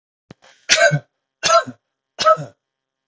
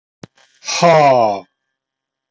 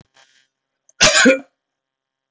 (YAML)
three_cough_length: 3.1 s
three_cough_amplitude: 31293
three_cough_signal_mean_std_ratio: 0.38
exhalation_length: 2.3 s
exhalation_amplitude: 31293
exhalation_signal_mean_std_ratio: 0.44
cough_length: 2.3 s
cough_amplitude: 31293
cough_signal_mean_std_ratio: 0.32
survey_phase: beta (2021-08-13 to 2022-03-07)
age: 45-64
gender: Male
wearing_mask: 'No'
symptom_none: true
smoker_status: Current smoker (e-cigarettes or vapes only)
respiratory_condition_asthma: false
respiratory_condition_other: false
recruitment_source: REACT
submission_delay: 0 days
covid_test_result: Negative
covid_test_method: RT-qPCR
influenza_a_test_result: Negative
influenza_b_test_result: Negative